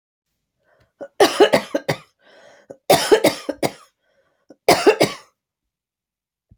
{"cough_length": "6.6 s", "cough_amplitude": 32767, "cough_signal_mean_std_ratio": 0.33, "survey_phase": "alpha (2021-03-01 to 2021-08-12)", "age": "65+", "gender": "Female", "wearing_mask": "No", "symptom_none": true, "smoker_status": "Ex-smoker", "respiratory_condition_asthma": false, "respiratory_condition_other": false, "recruitment_source": "REACT", "submission_delay": "2 days", "covid_test_result": "Negative", "covid_test_method": "RT-qPCR"}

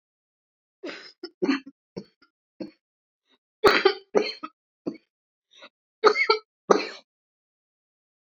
{"cough_length": "8.3 s", "cough_amplitude": 26898, "cough_signal_mean_std_ratio": 0.27, "survey_phase": "beta (2021-08-13 to 2022-03-07)", "age": "45-64", "gender": "Female", "wearing_mask": "No", "symptom_cough_any": true, "symptom_shortness_of_breath": true, "symptom_sore_throat": true, "symptom_onset": "12 days", "smoker_status": "Never smoked", "respiratory_condition_asthma": false, "respiratory_condition_other": true, "recruitment_source": "REACT", "submission_delay": "2 days", "covid_test_result": "Negative", "covid_test_method": "RT-qPCR"}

